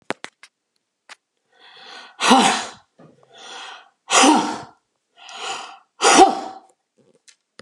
{"exhalation_length": "7.6 s", "exhalation_amplitude": 32767, "exhalation_signal_mean_std_ratio": 0.34, "survey_phase": "alpha (2021-03-01 to 2021-08-12)", "age": "65+", "gender": "Female", "wearing_mask": "No", "symptom_none": true, "smoker_status": "Never smoked", "respiratory_condition_asthma": true, "respiratory_condition_other": false, "recruitment_source": "REACT", "submission_delay": "1 day", "covid_test_result": "Negative", "covid_test_method": "RT-qPCR"}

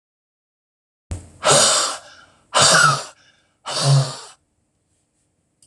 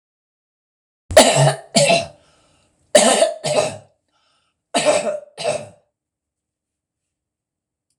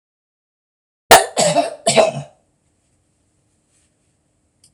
{"exhalation_length": "5.7 s", "exhalation_amplitude": 26019, "exhalation_signal_mean_std_ratio": 0.42, "three_cough_length": "8.0 s", "three_cough_amplitude": 26028, "three_cough_signal_mean_std_ratio": 0.38, "cough_length": "4.7 s", "cough_amplitude": 26028, "cough_signal_mean_std_ratio": 0.29, "survey_phase": "beta (2021-08-13 to 2022-03-07)", "age": "65+", "gender": "Female", "wearing_mask": "No", "symptom_none": true, "smoker_status": "Never smoked", "respiratory_condition_asthma": false, "respiratory_condition_other": false, "recruitment_source": "REACT", "submission_delay": "1 day", "covid_test_result": "Negative", "covid_test_method": "RT-qPCR"}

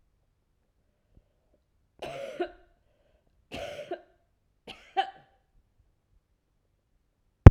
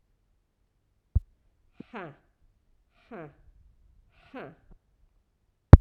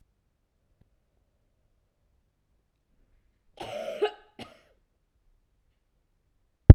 {"three_cough_length": "7.5 s", "three_cough_amplitude": 32768, "three_cough_signal_mean_std_ratio": 0.1, "exhalation_length": "5.8 s", "exhalation_amplitude": 32768, "exhalation_signal_mean_std_ratio": 0.09, "cough_length": "6.7 s", "cough_amplitude": 32768, "cough_signal_mean_std_ratio": 0.09, "survey_phase": "alpha (2021-03-01 to 2021-08-12)", "age": "65+", "gender": "Female", "wearing_mask": "No", "symptom_cough_any": true, "symptom_shortness_of_breath": true, "symptom_abdominal_pain": true, "symptom_diarrhoea": true, "symptom_fatigue": true, "symptom_fever_high_temperature": true, "symptom_headache": true, "symptom_onset": "3 days", "smoker_status": "Ex-smoker", "respiratory_condition_asthma": false, "respiratory_condition_other": false, "recruitment_source": "Test and Trace", "submission_delay": "1 day", "covid_test_result": "Positive", "covid_test_method": "RT-qPCR", "covid_ct_value": 17.3, "covid_ct_gene": "ORF1ab gene", "covid_ct_mean": 18.5, "covid_viral_load": "870000 copies/ml", "covid_viral_load_category": "Low viral load (10K-1M copies/ml)"}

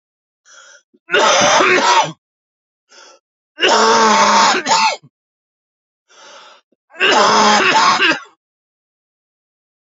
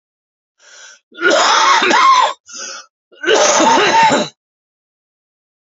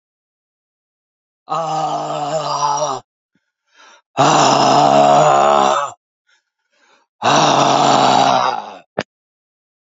{"three_cough_length": "9.9 s", "three_cough_amplitude": 32768, "three_cough_signal_mean_std_ratio": 0.53, "cough_length": "5.7 s", "cough_amplitude": 32768, "cough_signal_mean_std_ratio": 0.58, "exhalation_length": "10.0 s", "exhalation_amplitude": 31652, "exhalation_signal_mean_std_ratio": 0.58, "survey_phase": "alpha (2021-03-01 to 2021-08-12)", "age": "45-64", "gender": "Male", "wearing_mask": "No", "symptom_cough_any": true, "symptom_new_continuous_cough": true, "symptom_fatigue": true, "symptom_fever_high_temperature": true, "symptom_change_to_sense_of_smell_or_taste": true, "symptom_onset": "3 days", "smoker_status": "Ex-smoker", "respiratory_condition_asthma": false, "respiratory_condition_other": false, "recruitment_source": "Test and Trace", "submission_delay": "2 days", "covid_test_result": "Positive", "covid_test_method": "RT-qPCR", "covid_ct_value": 14.0, "covid_ct_gene": "ORF1ab gene", "covid_ct_mean": 14.5, "covid_viral_load": "17000000 copies/ml", "covid_viral_load_category": "High viral load (>1M copies/ml)"}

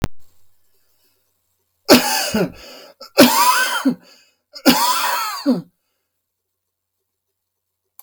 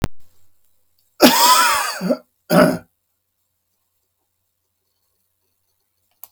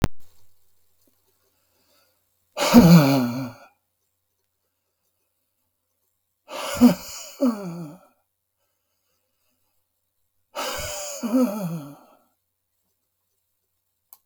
{"three_cough_length": "8.0 s", "three_cough_amplitude": 32768, "three_cough_signal_mean_std_ratio": 0.41, "cough_length": "6.3 s", "cough_amplitude": 32768, "cough_signal_mean_std_ratio": 0.35, "exhalation_length": "14.3 s", "exhalation_amplitude": 32768, "exhalation_signal_mean_std_ratio": 0.29, "survey_phase": "beta (2021-08-13 to 2022-03-07)", "age": "65+", "gender": "Male", "wearing_mask": "No", "symptom_none": true, "smoker_status": "Never smoked", "respiratory_condition_asthma": false, "respiratory_condition_other": false, "recruitment_source": "REACT", "submission_delay": "7 days", "covid_test_result": "Negative", "covid_test_method": "RT-qPCR", "influenza_a_test_result": "Negative", "influenza_b_test_result": "Negative"}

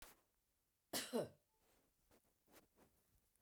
{"cough_length": "3.4 s", "cough_amplitude": 1124, "cough_signal_mean_std_ratio": 0.27, "survey_phase": "beta (2021-08-13 to 2022-03-07)", "age": "65+", "gender": "Female", "wearing_mask": "No", "symptom_none": true, "smoker_status": "Never smoked", "respiratory_condition_asthma": false, "respiratory_condition_other": false, "recruitment_source": "REACT", "submission_delay": "2 days", "covid_test_result": "Negative", "covid_test_method": "RT-qPCR"}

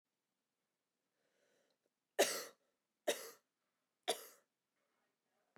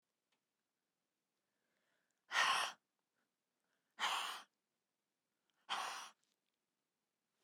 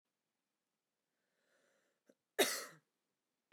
{"three_cough_length": "5.6 s", "three_cough_amplitude": 3566, "three_cough_signal_mean_std_ratio": 0.21, "exhalation_length": "7.4 s", "exhalation_amplitude": 2524, "exhalation_signal_mean_std_ratio": 0.29, "cough_length": "3.5 s", "cough_amplitude": 4010, "cough_signal_mean_std_ratio": 0.19, "survey_phase": "beta (2021-08-13 to 2022-03-07)", "age": "18-44", "gender": "Female", "wearing_mask": "No", "symptom_cough_any": true, "symptom_fatigue": true, "smoker_status": "Never smoked", "respiratory_condition_asthma": true, "respiratory_condition_other": false, "recruitment_source": "REACT", "submission_delay": "1 day", "covid_test_result": "Negative", "covid_test_method": "RT-qPCR"}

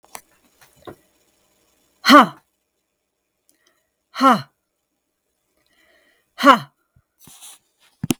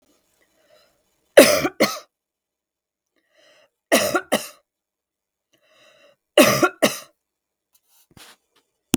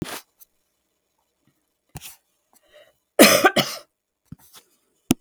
{"exhalation_length": "8.2 s", "exhalation_amplitude": 32768, "exhalation_signal_mean_std_ratio": 0.22, "three_cough_length": "9.0 s", "three_cough_amplitude": 32768, "three_cough_signal_mean_std_ratio": 0.26, "cough_length": "5.2 s", "cough_amplitude": 32768, "cough_signal_mean_std_ratio": 0.23, "survey_phase": "beta (2021-08-13 to 2022-03-07)", "age": "45-64", "gender": "Female", "wearing_mask": "No", "symptom_none": true, "smoker_status": "Never smoked", "respiratory_condition_asthma": false, "respiratory_condition_other": false, "recruitment_source": "REACT", "submission_delay": "1 day", "covid_test_result": "Negative", "covid_test_method": "RT-qPCR", "influenza_a_test_result": "Negative", "influenza_b_test_result": "Negative"}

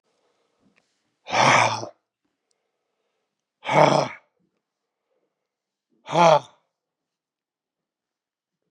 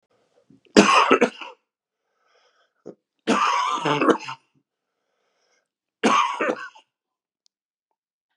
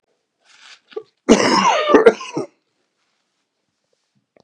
{"exhalation_length": "8.7 s", "exhalation_amplitude": 28959, "exhalation_signal_mean_std_ratio": 0.27, "three_cough_length": "8.4 s", "three_cough_amplitude": 32768, "three_cough_signal_mean_std_ratio": 0.36, "cough_length": "4.4 s", "cough_amplitude": 32768, "cough_signal_mean_std_ratio": 0.35, "survey_phase": "beta (2021-08-13 to 2022-03-07)", "age": "65+", "gender": "Male", "wearing_mask": "No", "symptom_cough_any": true, "symptom_runny_or_blocked_nose": true, "symptom_shortness_of_breath": true, "symptom_sore_throat": true, "symptom_headache": true, "symptom_onset": "3 days", "smoker_status": "Ex-smoker", "respiratory_condition_asthma": false, "respiratory_condition_other": false, "recruitment_source": "Test and Trace", "submission_delay": "1 day", "covid_test_result": "Positive", "covid_test_method": "ePCR"}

